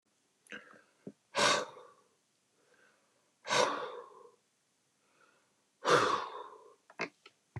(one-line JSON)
{"exhalation_length": "7.6 s", "exhalation_amplitude": 7749, "exhalation_signal_mean_std_ratio": 0.33, "survey_phase": "beta (2021-08-13 to 2022-03-07)", "age": "65+", "gender": "Male", "wearing_mask": "No", "symptom_none": true, "smoker_status": "Never smoked", "respiratory_condition_asthma": false, "respiratory_condition_other": false, "recruitment_source": "REACT", "submission_delay": "2 days", "covid_test_result": "Negative", "covid_test_method": "RT-qPCR", "influenza_a_test_result": "Negative", "influenza_b_test_result": "Negative"}